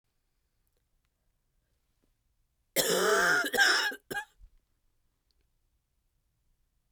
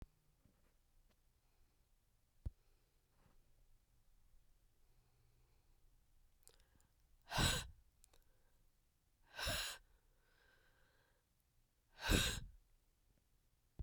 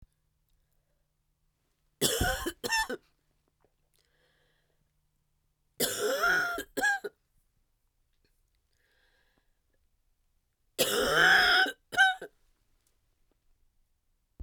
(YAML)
cough_length: 6.9 s
cough_amplitude: 8024
cough_signal_mean_std_ratio: 0.35
exhalation_length: 13.8 s
exhalation_amplitude: 3306
exhalation_signal_mean_std_ratio: 0.26
three_cough_length: 14.4 s
three_cough_amplitude: 11123
three_cough_signal_mean_std_ratio: 0.35
survey_phase: beta (2021-08-13 to 2022-03-07)
age: 45-64
gender: Female
wearing_mask: 'No'
symptom_cough_any: true
symptom_new_continuous_cough: true
symptom_shortness_of_breath: true
symptom_sore_throat: true
symptom_fatigue: true
symptom_headache: true
symptom_onset: 3 days
smoker_status: Ex-smoker
respiratory_condition_asthma: false
respiratory_condition_other: false
recruitment_source: Test and Trace
submission_delay: 2 days
covid_test_result: Positive
covid_test_method: RT-qPCR